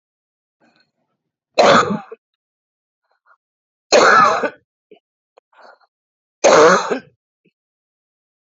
{"three_cough_length": "8.5 s", "three_cough_amplitude": 32768, "three_cough_signal_mean_std_ratio": 0.33, "survey_phase": "beta (2021-08-13 to 2022-03-07)", "age": "45-64", "gender": "Female", "wearing_mask": "No", "symptom_cough_any": true, "symptom_fatigue": true, "symptom_headache": true, "symptom_onset": "6 days", "smoker_status": "Current smoker (1 to 10 cigarettes per day)", "respiratory_condition_asthma": false, "respiratory_condition_other": false, "recruitment_source": "Test and Trace", "submission_delay": "2 days", "covid_test_result": "Negative", "covid_test_method": "RT-qPCR"}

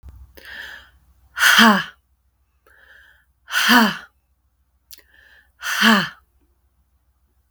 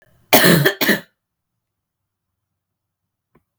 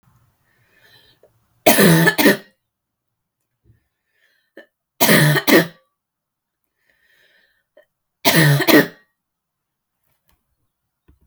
{"exhalation_length": "7.5 s", "exhalation_amplitude": 32768, "exhalation_signal_mean_std_ratio": 0.34, "cough_length": "3.6 s", "cough_amplitude": 32768, "cough_signal_mean_std_ratio": 0.31, "three_cough_length": "11.3 s", "three_cough_amplitude": 32768, "three_cough_signal_mean_std_ratio": 0.32, "survey_phase": "beta (2021-08-13 to 2022-03-07)", "age": "18-44", "gender": "Female", "wearing_mask": "No", "symptom_runny_or_blocked_nose": true, "symptom_diarrhoea": true, "symptom_headache": true, "symptom_onset": "2 days", "smoker_status": "Never smoked", "respiratory_condition_asthma": false, "respiratory_condition_other": false, "recruitment_source": "Test and Trace", "submission_delay": "1 day", "covid_test_result": "Positive", "covid_test_method": "RT-qPCR", "covid_ct_value": 28.2, "covid_ct_gene": "ORF1ab gene", "covid_ct_mean": 28.6, "covid_viral_load": "430 copies/ml", "covid_viral_load_category": "Minimal viral load (< 10K copies/ml)"}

